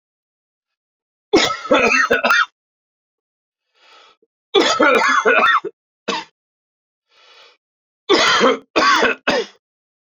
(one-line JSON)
{"three_cough_length": "10.1 s", "three_cough_amplitude": 28719, "three_cough_signal_mean_std_ratio": 0.48, "survey_phase": "beta (2021-08-13 to 2022-03-07)", "age": "45-64", "gender": "Male", "wearing_mask": "No", "symptom_cough_any": true, "symptom_runny_or_blocked_nose": true, "symptom_fatigue": true, "symptom_headache": true, "symptom_change_to_sense_of_smell_or_taste": true, "symptom_loss_of_taste": true, "symptom_onset": "3 days", "smoker_status": "Never smoked", "respiratory_condition_asthma": false, "respiratory_condition_other": false, "recruitment_source": "Test and Trace", "submission_delay": "1 day", "covid_test_result": "Positive", "covid_test_method": "RT-qPCR"}